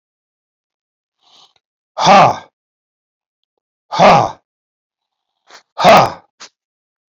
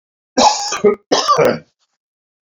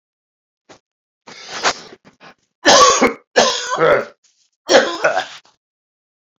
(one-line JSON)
{"exhalation_length": "7.1 s", "exhalation_amplitude": 30433, "exhalation_signal_mean_std_ratio": 0.32, "cough_length": "2.6 s", "cough_amplitude": 30124, "cough_signal_mean_std_ratio": 0.49, "three_cough_length": "6.4 s", "three_cough_amplitude": 30791, "three_cough_signal_mean_std_ratio": 0.41, "survey_phase": "beta (2021-08-13 to 2022-03-07)", "age": "45-64", "gender": "Male", "wearing_mask": "No", "symptom_runny_or_blocked_nose": true, "symptom_fatigue": true, "symptom_fever_high_temperature": true, "symptom_headache": true, "symptom_onset": "3 days", "smoker_status": "Never smoked", "respiratory_condition_asthma": false, "respiratory_condition_other": false, "recruitment_source": "Test and Trace", "submission_delay": "2 days", "covid_test_result": "Positive", "covid_test_method": "RT-qPCR", "covid_ct_value": 16.4, "covid_ct_gene": "ORF1ab gene", "covid_ct_mean": 17.0, "covid_viral_load": "2700000 copies/ml", "covid_viral_load_category": "High viral load (>1M copies/ml)"}